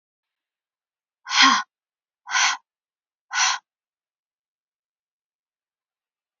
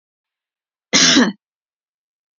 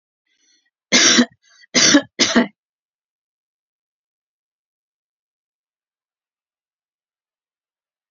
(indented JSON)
{
  "exhalation_length": "6.4 s",
  "exhalation_amplitude": 24330,
  "exhalation_signal_mean_std_ratio": 0.27,
  "cough_length": "2.4 s",
  "cough_amplitude": 32768,
  "cough_signal_mean_std_ratio": 0.33,
  "three_cough_length": "8.1 s",
  "three_cough_amplitude": 32767,
  "three_cough_signal_mean_std_ratio": 0.25,
  "survey_phase": "beta (2021-08-13 to 2022-03-07)",
  "age": "45-64",
  "gender": "Female",
  "wearing_mask": "No",
  "symptom_headache": true,
  "smoker_status": "Prefer not to say",
  "respiratory_condition_asthma": false,
  "respiratory_condition_other": false,
  "recruitment_source": "REACT",
  "submission_delay": "1 day",
  "covid_test_result": "Negative",
  "covid_test_method": "RT-qPCR",
  "influenza_a_test_result": "Negative",
  "influenza_b_test_result": "Negative"
}